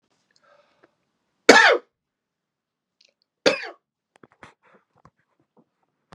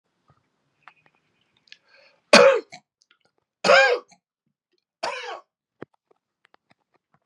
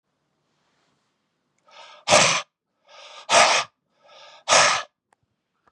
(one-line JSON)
{"cough_length": "6.1 s", "cough_amplitude": 32768, "cough_signal_mean_std_ratio": 0.19, "three_cough_length": "7.3 s", "three_cough_amplitude": 31950, "three_cough_signal_mean_std_ratio": 0.24, "exhalation_length": "5.7 s", "exhalation_amplitude": 29139, "exhalation_signal_mean_std_ratio": 0.34, "survey_phase": "beta (2021-08-13 to 2022-03-07)", "age": "45-64", "gender": "Male", "wearing_mask": "No", "symptom_cough_any": true, "symptom_shortness_of_breath": true, "symptom_sore_throat": true, "smoker_status": "Never smoked", "respiratory_condition_asthma": false, "respiratory_condition_other": false, "recruitment_source": "REACT", "submission_delay": "4 days", "covid_test_result": "Negative", "covid_test_method": "RT-qPCR", "influenza_a_test_result": "Negative", "influenza_b_test_result": "Negative"}